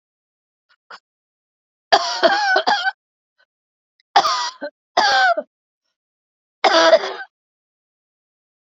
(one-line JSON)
{"three_cough_length": "8.6 s", "three_cough_amplitude": 29433, "three_cough_signal_mean_std_ratio": 0.39, "survey_phase": "beta (2021-08-13 to 2022-03-07)", "age": "65+", "gender": "Female", "wearing_mask": "Yes", "symptom_cough_any": true, "symptom_runny_or_blocked_nose": true, "symptom_fatigue": true, "symptom_headache": true, "symptom_onset": "4 days", "smoker_status": "Ex-smoker", "respiratory_condition_asthma": false, "respiratory_condition_other": true, "recruitment_source": "Test and Trace", "submission_delay": "2 days", "covid_test_result": "Positive", "covid_test_method": "RT-qPCR", "covid_ct_value": 16.4, "covid_ct_gene": "ORF1ab gene", "covid_ct_mean": 16.7, "covid_viral_load": "3400000 copies/ml", "covid_viral_load_category": "High viral load (>1M copies/ml)"}